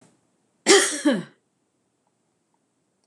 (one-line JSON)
{"cough_length": "3.1 s", "cough_amplitude": 26027, "cough_signal_mean_std_ratio": 0.29, "survey_phase": "beta (2021-08-13 to 2022-03-07)", "age": "65+", "gender": "Female", "wearing_mask": "No", "symptom_none": true, "smoker_status": "Never smoked", "respiratory_condition_asthma": false, "respiratory_condition_other": false, "recruitment_source": "REACT", "submission_delay": "3 days", "covid_test_result": "Negative", "covid_test_method": "RT-qPCR", "influenza_a_test_result": "Negative", "influenza_b_test_result": "Negative"}